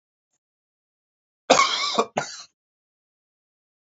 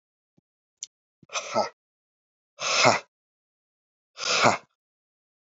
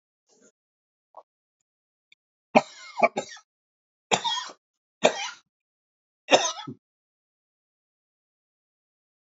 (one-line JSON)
{"cough_length": "3.8 s", "cough_amplitude": 26863, "cough_signal_mean_std_ratio": 0.28, "exhalation_length": "5.5 s", "exhalation_amplitude": 22836, "exhalation_signal_mean_std_ratio": 0.31, "three_cough_length": "9.2 s", "three_cough_amplitude": 27226, "three_cough_signal_mean_std_ratio": 0.21, "survey_phase": "beta (2021-08-13 to 2022-03-07)", "age": "45-64", "gender": "Male", "wearing_mask": "No", "symptom_cough_any": true, "symptom_new_continuous_cough": true, "symptom_fatigue": true, "symptom_headache": true, "symptom_onset": "3 days", "smoker_status": "Never smoked", "respiratory_condition_asthma": false, "respiratory_condition_other": false, "recruitment_source": "Test and Trace", "submission_delay": "2 days", "covid_test_result": "Positive", "covid_test_method": "RT-qPCR", "covid_ct_value": 29.3, "covid_ct_gene": "ORF1ab gene", "covid_ct_mean": 30.2, "covid_viral_load": "120 copies/ml", "covid_viral_load_category": "Minimal viral load (< 10K copies/ml)"}